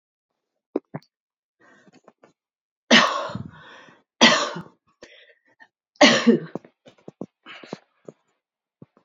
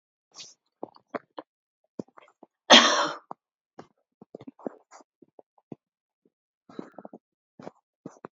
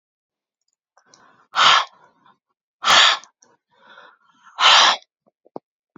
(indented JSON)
{
  "three_cough_length": "9.0 s",
  "three_cough_amplitude": 29025,
  "three_cough_signal_mean_std_ratio": 0.27,
  "cough_length": "8.4 s",
  "cough_amplitude": 30455,
  "cough_signal_mean_std_ratio": 0.17,
  "exhalation_length": "6.0 s",
  "exhalation_amplitude": 30951,
  "exhalation_signal_mean_std_ratio": 0.33,
  "survey_phase": "beta (2021-08-13 to 2022-03-07)",
  "age": "65+",
  "gender": "Female",
  "wearing_mask": "No",
  "symptom_none": true,
  "symptom_onset": "12 days",
  "smoker_status": "Never smoked",
  "respiratory_condition_asthma": false,
  "respiratory_condition_other": false,
  "recruitment_source": "REACT",
  "submission_delay": "1 day",
  "covid_test_result": "Negative",
  "covid_test_method": "RT-qPCR"
}